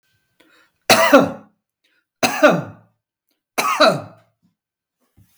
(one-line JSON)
{"three_cough_length": "5.4 s", "three_cough_amplitude": 32768, "three_cough_signal_mean_std_ratio": 0.35, "survey_phase": "beta (2021-08-13 to 2022-03-07)", "age": "65+", "gender": "Male", "wearing_mask": "No", "symptom_headache": true, "smoker_status": "Ex-smoker", "respiratory_condition_asthma": false, "respiratory_condition_other": false, "recruitment_source": "REACT", "submission_delay": "2 days", "covid_test_result": "Negative", "covid_test_method": "RT-qPCR", "influenza_a_test_result": "Negative", "influenza_b_test_result": "Negative"}